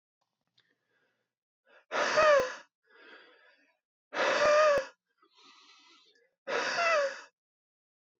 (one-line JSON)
{"exhalation_length": "8.2 s", "exhalation_amplitude": 7655, "exhalation_signal_mean_std_ratio": 0.41, "survey_phase": "beta (2021-08-13 to 2022-03-07)", "age": "18-44", "gender": "Male", "wearing_mask": "No", "symptom_cough_any": true, "symptom_runny_or_blocked_nose": true, "symptom_sore_throat": true, "symptom_abdominal_pain": true, "symptom_fatigue": true, "symptom_headache": true, "smoker_status": "Never smoked", "respiratory_condition_asthma": true, "respiratory_condition_other": false, "recruitment_source": "Test and Trace", "submission_delay": "2 days", "covid_test_result": "Positive", "covid_test_method": "LFT"}